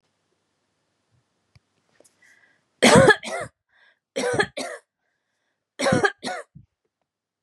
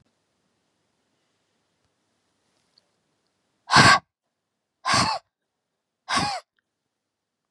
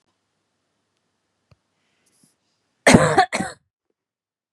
{
  "three_cough_length": "7.4 s",
  "three_cough_amplitude": 30211,
  "three_cough_signal_mean_std_ratio": 0.29,
  "exhalation_length": "7.5 s",
  "exhalation_amplitude": 29030,
  "exhalation_signal_mean_std_ratio": 0.24,
  "cough_length": "4.5 s",
  "cough_amplitude": 32768,
  "cough_signal_mean_std_ratio": 0.23,
  "survey_phase": "beta (2021-08-13 to 2022-03-07)",
  "age": "45-64",
  "gender": "Female",
  "wearing_mask": "No",
  "symptom_change_to_sense_of_smell_or_taste": true,
  "smoker_status": "Current smoker (1 to 10 cigarettes per day)",
  "respiratory_condition_asthma": false,
  "respiratory_condition_other": false,
  "recruitment_source": "REACT",
  "submission_delay": "2 days",
  "covid_test_result": "Negative",
  "covid_test_method": "RT-qPCR",
  "influenza_a_test_result": "Negative",
  "influenza_b_test_result": "Negative"
}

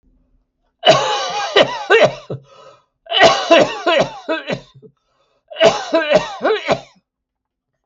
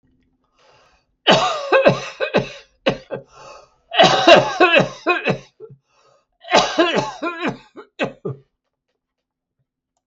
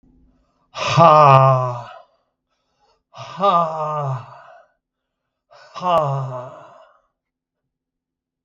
{
  "cough_length": "7.9 s",
  "cough_amplitude": 32768,
  "cough_signal_mean_std_ratio": 0.49,
  "three_cough_length": "10.1 s",
  "three_cough_amplitude": 32768,
  "three_cough_signal_mean_std_ratio": 0.42,
  "exhalation_length": "8.4 s",
  "exhalation_amplitude": 32768,
  "exhalation_signal_mean_std_ratio": 0.39,
  "survey_phase": "beta (2021-08-13 to 2022-03-07)",
  "age": "65+",
  "gender": "Male",
  "wearing_mask": "No",
  "symptom_none": true,
  "smoker_status": "Never smoked",
  "respiratory_condition_asthma": false,
  "respiratory_condition_other": false,
  "recruitment_source": "REACT",
  "submission_delay": "5 days",
  "covid_test_result": "Negative",
  "covid_test_method": "RT-qPCR",
  "influenza_a_test_result": "Negative",
  "influenza_b_test_result": "Negative"
}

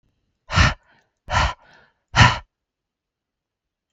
{
  "exhalation_length": "3.9 s",
  "exhalation_amplitude": 32760,
  "exhalation_signal_mean_std_ratio": 0.3,
  "survey_phase": "beta (2021-08-13 to 2022-03-07)",
  "age": "45-64",
  "gender": "Male",
  "wearing_mask": "No",
  "symptom_none": true,
  "symptom_onset": "2 days",
  "smoker_status": "Never smoked",
  "respiratory_condition_asthma": false,
  "respiratory_condition_other": false,
  "recruitment_source": "Test and Trace",
  "submission_delay": "1 day",
  "covid_test_result": "Negative",
  "covid_test_method": "RT-qPCR"
}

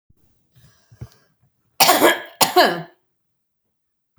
{
  "cough_length": "4.2 s",
  "cough_amplitude": 32768,
  "cough_signal_mean_std_ratio": 0.32,
  "survey_phase": "beta (2021-08-13 to 2022-03-07)",
  "age": "65+",
  "gender": "Female",
  "wearing_mask": "No",
  "symptom_none": true,
  "smoker_status": "Ex-smoker",
  "respiratory_condition_asthma": false,
  "respiratory_condition_other": false,
  "recruitment_source": "REACT",
  "submission_delay": "3 days",
  "covid_test_result": "Negative",
  "covid_test_method": "RT-qPCR"
}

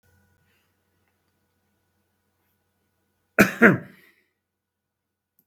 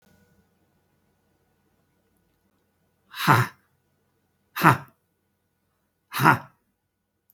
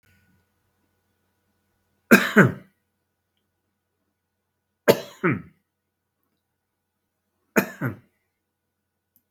{
  "cough_length": "5.5 s",
  "cough_amplitude": 32657,
  "cough_signal_mean_std_ratio": 0.17,
  "exhalation_length": "7.3 s",
  "exhalation_amplitude": 32657,
  "exhalation_signal_mean_std_ratio": 0.22,
  "three_cough_length": "9.3 s",
  "three_cough_amplitude": 32657,
  "three_cough_signal_mean_std_ratio": 0.2,
  "survey_phase": "beta (2021-08-13 to 2022-03-07)",
  "age": "65+",
  "gender": "Male",
  "wearing_mask": "No",
  "symptom_abdominal_pain": true,
  "symptom_fatigue": true,
  "smoker_status": "Never smoked",
  "respiratory_condition_asthma": true,
  "respiratory_condition_other": false,
  "recruitment_source": "Test and Trace",
  "submission_delay": "3 days",
  "covid_test_result": "Positive",
  "covid_test_method": "RT-qPCR"
}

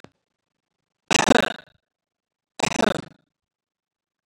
{
  "three_cough_length": "4.3 s",
  "three_cough_amplitude": 32404,
  "three_cough_signal_mean_std_ratio": 0.24,
  "survey_phase": "beta (2021-08-13 to 2022-03-07)",
  "age": "45-64",
  "gender": "Male",
  "wearing_mask": "No",
  "symptom_none": true,
  "smoker_status": "Never smoked",
  "respiratory_condition_asthma": false,
  "respiratory_condition_other": false,
  "recruitment_source": "REACT",
  "submission_delay": "0 days",
  "covid_test_result": "Negative",
  "covid_test_method": "RT-qPCR",
  "influenza_a_test_result": "Negative",
  "influenza_b_test_result": "Negative"
}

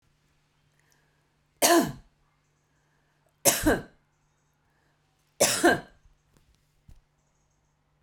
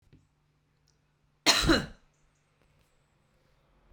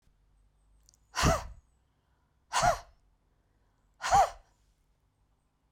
{
  "three_cough_length": "8.0 s",
  "three_cough_amplitude": 23890,
  "three_cough_signal_mean_std_ratio": 0.27,
  "cough_length": "3.9 s",
  "cough_amplitude": 17682,
  "cough_signal_mean_std_ratio": 0.25,
  "exhalation_length": "5.7 s",
  "exhalation_amplitude": 7902,
  "exhalation_signal_mean_std_ratio": 0.29,
  "survey_phase": "beta (2021-08-13 to 2022-03-07)",
  "age": "45-64",
  "gender": "Female",
  "wearing_mask": "No",
  "symptom_cough_any": true,
  "symptom_runny_or_blocked_nose": true,
  "symptom_onset": "3 days",
  "smoker_status": "Never smoked",
  "respiratory_condition_asthma": false,
  "respiratory_condition_other": false,
  "recruitment_source": "REACT",
  "submission_delay": "1 day",
  "covid_test_result": "Negative",
  "covid_test_method": "RT-qPCR"
}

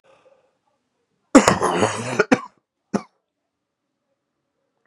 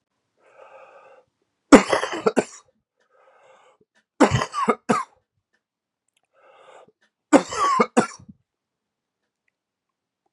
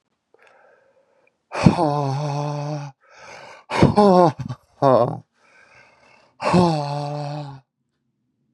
{
  "cough_length": "4.9 s",
  "cough_amplitude": 32768,
  "cough_signal_mean_std_ratio": 0.27,
  "three_cough_length": "10.3 s",
  "three_cough_amplitude": 32768,
  "three_cough_signal_mean_std_ratio": 0.25,
  "exhalation_length": "8.5 s",
  "exhalation_amplitude": 32768,
  "exhalation_signal_mean_std_ratio": 0.42,
  "survey_phase": "beta (2021-08-13 to 2022-03-07)",
  "age": "45-64",
  "gender": "Male",
  "wearing_mask": "No",
  "symptom_cough_any": true,
  "symptom_onset": "5 days",
  "smoker_status": "Never smoked",
  "respiratory_condition_asthma": false,
  "respiratory_condition_other": false,
  "recruitment_source": "Test and Trace",
  "submission_delay": "1 day",
  "covid_test_result": "Positive",
  "covid_test_method": "RT-qPCR",
  "covid_ct_value": 12.3,
  "covid_ct_gene": "ORF1ab gene"
}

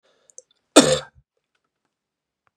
{
  "cough_length": "2.6 s",
  "cough_amplitude": 32768,
  "cough_signal_mean_std_ratio": 0.2,
  "survey_phase": "beta (2021-08-13 to 2022-03-07)",
  "age": "18-44",
  "gender": "Male",
  "wearing_mask": "No",
  "symptom_cough_any": true,
  "symptom_runny_or_blocked_nose": true,
  "symptom_sore_throat": true,
  "symptom_onset": "3 days",
  "smoker_status": "Never smoked",
  "respiratory_condition_asthma": false,
  "respiratory_condition_other": false,
  "recruitment_source": "Test and Trace",
  "submission_delay": "1 day",
  "covid_test_result": "Positive",
  "covid_test_method": "ePCR"
}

